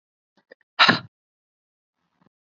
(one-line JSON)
{"exhalation_length": "2.6 s", "exhalation_amplitude": 28721, "exhalation_signal_mean_std_ratio": 0.2, "survey_phase": "beta (2021-08-13 to 2022-03-07)", "age": "18-44", "gender": "Female", "wearing_mask": "No", "symptom_none": true, "smoker_status": "Never smoked", "respiratory_condition_asthma": false, "respiratory_condition_other": false, "recruitment_source": "Test and Trace", "submission_delay": "1 day", "covid_test_result": "Positive", "covid_test_method": "RT-qPCR", "covid_ct_value": 29.8, "covid_ct_gene": "ORF1ab gene"}